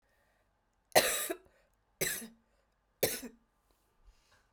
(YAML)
three_cough_length: 4.5 s
three_cough_amplitude: 11481
three_cough_signal_mean_std_ratio: 0.28
survey_phase: beta (2021-08-13 to 2022-03-07)
age: 18-44
gender: Female
wearing_mask: 'No'
symptom_cough_any: true
symptom_runny_or_blocked_nose: true
symptom_fatigue: true
symptom_headache: true
symptom_change_to_sense_of_smell_or_taste: true
symptom_loss_of_taste: true
symptom_onset: 14 days
smoker_status: Never smoked
respiratory_condition_asthma: false
respiratory_condition_other: false
recruitment_source: Test and Trace
submission_delay: 12 days
covid_test_result: Negative
covid_test_method: RT-qPCR